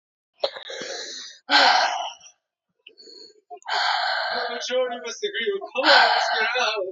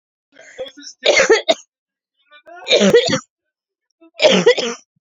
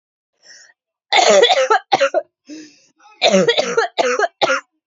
{"exhalation_length": "6.9 s", "exhalation_amplitude": 22121, "exhalation_signal_mean_std_ratio": 0.62, "three_cough_length": "5.1 s", "three_cough_amplitude": 30879, "three_cough_signal_mean_std_ratio": 0.43, "cough_length": "4.9 s", "cough_amplitude": 30719, "cough_signal_mean_std_ratio": 0.54, "survey_phase": "beta (2021-08-13 to 2022-03-07)", "age": "18-44", "gender": "Female", "wearing_mask": "No", "symptom_cough_any": true, "symptom_runny_or_blocked_nose": true, "symptom_fatigue": true, "symptom_headache": true, "symptom_loss_of_taste": true, "smoker_status": "Never smoked", "respiratory_condition_asthma": false, "respiratory_condition_other": false, "recruitment_source": "Test and Trace", "submission_delay": "2 days", "covid_test_result": "Positive", "covid_test_method": "RT-qPCR", "covid_ct_value": 17.2, "covid_ct_gene": "ORF1ab gene", "covid_ct_mean": 17.4, "covid_viral_load": "2000000 copies/ml", "covid_viral_load_category": "High viral load (>1M copies/ml)"}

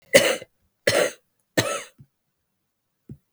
{"three_cough_length": "3.3 s", "three_cough_amplitude": 32768, "three_cough_signal_mean_std_ratio": 0.32, "survey_phase": "beta (2021-08-13 to 2022-03-07)", "age": "18-44", "gender": "Female", "wearing_mask": "No", "symptom_cough_any": true, "symptom_runny_or_blocked_nose": true, "symptom_sore_throat": true, "symptom_abdominal_pain": true, "symptom_headache": true, "symptom_change_to_sense_of_smell_or_taste": true, "smoker_status": "Ex-smoker", "respiratory_condition_asthma": false, "respiratory_condition_other": false, "recruitment_source": "Test and Trace", "submission_delay": "2 days", "covid_test_result": "Positive", "covid_test_method": "RT-qPCR", "covid_ct_value": 31.2, "covid_ct_gene": "ORF1ab gene"}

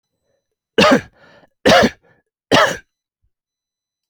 {"three_cough_length": "4.1 s", "three_cough_amplitude": 29910, "three_cough_signal_mean_std_ratio": 0.34, "survey_phase": "alpha (2021-03-01 to 2021-08-12)", "age": "45-64", "gender": "Male", "wearing_mask": "No", "symptom_none": true, "smoker_status": "Ex-smoker", "respiratory_condition_asthma": false, "respiratory_condition_other": false, "recruitment_source": "REACT", "submission_delay": "2 days", "covid_test_result": "Negative", "covid_test_method": "RT-qPCR"}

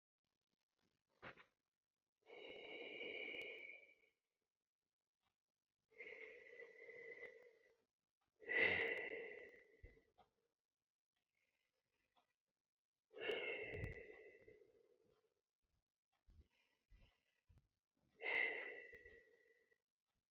{"exhalation_length": "20.3 s", "exhalation_amplitude": 1634, "exhalation_signal_mean_std_ratio": 0.35, "survey_phase": "beta (2021-08-13 to 2022-03-07)", "age": "45-64", "gender": "Female", "wearing_mask": "No", "symptom_runny_or_blocked_nose": true, "symptom_headache": true, "symptom_change_to_sense_of_smell_or_taste": true, "smoker_status": "Current smoker (11 or more cigarettes per day)", "respiratory_condition_asthma": false, "respiratory_condition_other": false, "recruitment_source": "REACT", "submission_delay": "2 days", "covid_test_result": "Negative", "covid_test_method": "RT-qPCR"}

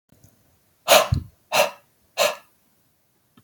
{"exhalation_length": "3.4 s", "exhalation_amplitude": 28813, "exhalation_signal_mean_std_ratio": 0.31, "survey_phase": "beta (2021-08-13 to 2022-03-07)", "age": "45-64", "gender": "Male", "wearing_mask": "No", "symptom_none": true, "smoker_status": "Never smoked", "respiratory_condition_asthma": false, "respiratory_condition_other": false, "recruitment_source": "REACT", "submission_delay": "2 days", "covid_test_result": "Negative", "covid_test_method": "RT-qPCR", "influenza_a_test_result": "Negative", "influenza_b_test_result": "Negative"}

